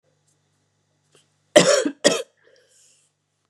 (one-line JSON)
{"cough_length": "3.5 s", "cough_amplitude": 32768, "cough_signal_mean_std_ratio": 0.27, "survey_phase": "beta (2021-08-13 to 2022-03-07)", "age": "18-44", "gender": "Female", "wearing_mask": "No", "symptom_cough_any": true, "symptom_runny_or_blocked_nose": true, "symptom_other": true, "smoker_status": "Never smoked", "respiratory_condition_asthma": false, "respiratory_condition_other": false, "recruitment_source": "Test and Trace", "submission_delay": "1 day", "covid_test_result": "Positive", "covid_test_method": "ePCR"}